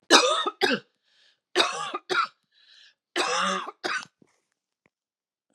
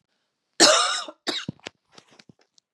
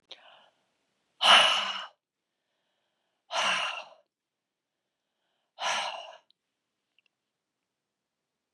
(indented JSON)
{
  "three_cough_length": "5.5 s",
  "three_cough_amplitude": 32766,
  "three_cough_signal_mean_std_ratio": 0.41,
  "cough_length": "2.7 s",
  "cough_amplitude": 30076,
  "cough_signal_mean_std_ratio": 0.33,
  "exhalation_length": "8.5 s",
  "exhalation_amplitude": 16655,
  "exhalation_signal_mean_std_ratio": 0.28,
  "survey_phase": "beta (2021-08-13 to 2022-03-07)",
  "age": "45-64",
  "gender": "Female",
  "wearing_mask": "No",
  "symptom_runny_or_blocked_nose": true,
  "symptom_sore_throat": true,
  "symptom_fatigue": true,
  "symptom_headache": true,
  "smoker_status": "Ex-smoker",
  "respiratory_condition_asthma": false,
  "respiratory_condition_other": false,
  "recruitment_source": "Test and Trace",
  "submission_delay": "1 day",
  "covid_test_result": "Positive",
  "covid_test_method": "LFT"
}